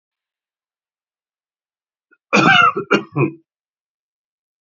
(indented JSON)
{
  "cough_length": "4.6 s",
  "cough_amplitude": 31132,
  "cough_signal_mean_std_ratio": 0.31,
  "survey_phase": "beta (2021-08-13 to 2022-03-07)",
  "age": "45-64",
  "gender": "Male",
  "wearing_mask": "No",
  "symptom_none": true,
  "smoker_status": "Ex-smoker",
  "respiratory_condition_asthma": true,
  "respiratory_condition_other": true,
  "recruitment_source": "REACT",
  "submission_delay": "2 days",
  "covid_test_result": "Negative",
  "covid_test_method": "RT-qPCR",
  "influenza_a_test_result": "Negative",
  "influenza_b_test_result": "Negative"
}